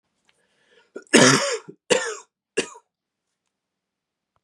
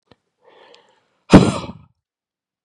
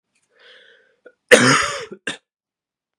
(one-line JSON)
{"three_cough_length": "4.4 s", "three_cough_amplitude": 32666, "three_cough_signal_mean_std_ratio": 0.29, "exhalation_length": "2.6 s", "exhalation_amplitude": 32768, "exhalation_signal_mean_std_ratio": 0.22, "cough_length": "3.0 s", "cough_amplitude": 32768, "cough_signal_mean_std_ratio": 0.29, "survey_phase": "beta (2021-08-13 to 2022-03-07)", "age": "18-44", "gender": "Male", "wearing_mask": "No", "symptom_cough_any": true, "symptom_runny_or_blocked_nose": true, "symptom_sore_throat": true, "smoker_status": "Never smoked", "respiratory_condition_asthma": false, "respiratory_condition_other": false, "recruitment_source": "Test and Trace", "submission_delay": "2 days", "covid_test_result": "Positive", "covid_test_method": "RT-qPCR", "covid_ct_value": 16.7, "covid_ct_gene": "ORF1ab gene", "covid_ct_mean": 16.8, "covid_viral_load": "3100000 copies/ml", "covid_viral_load_category": "High viral load (>1M copies/ml)"}